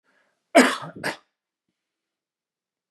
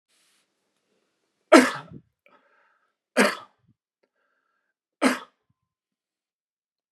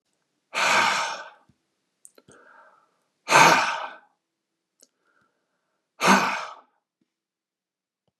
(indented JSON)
{
  "cough_length": "2.9 s",
  "cough_amplitude": 28613,
  "cough_signal_mean_std_ratio": 0.23,
  "three_cough_length": "6.9 s",
  "three_cough_amplitude": 32276,
  "three_cough_signal_mean_std_ratio": 0.19,
  "exhalation_length": "8.2 s",
  "exhalation_amplitude": 26703,
  "exhalation_signal_mean_std_ratio": 0.32,
  "survey_phase": "beta (2021-08-13 to 2022-03-07)",
  "age": "65+",
  "gender": "Male",
  "wearing_mask": "No",
  "symptom_none": true,
  "smoker_status": "Never smoked",
  "respiratory_condition_asthma": false,
  "respiratory_condition_other": false,
  "recruitment_source": "REACT",
  "submission_delay": "1 day",
  "covid_test_result": "Negative",
  "covid_test_method": "RT-qPCR"
}